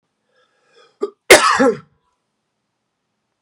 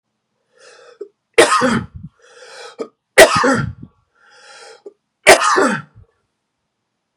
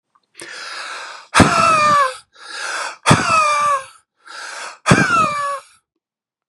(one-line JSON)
{"cough_length": "3.4 s", "cough_amplitude": 32768, "cough_signal_mean_std_ratio": 0.27, "three_cough_length": "7.2 s", "three_cough_amplitude": 32768, "three_cough_signal_mean_std_ratio": 0.35, "exhalation_length": "6.5 s", "exhalation_amplitude": 32768, "exhalation_signal_mean_std_ratio": 0.57, "survey_phase": "beta (2021-08-13 to 2022-03-07)", "age": "18-44", "gender": "Male", "wearing_mask": "No", "symptom_none": true, "symptom_onset": "4 days", "smoker_status": "Never smoked", "respiratory_condition_asthma": false, "respiratory_condition_other": false, "recruitment_source": "REACT", "submission_delay": "2 days", "covid_test_result": "Negative", "covid_test_method": "RT-qPCR", "influenza_a_test_result": "Negative", "influenza_b_test_result": "Negative"}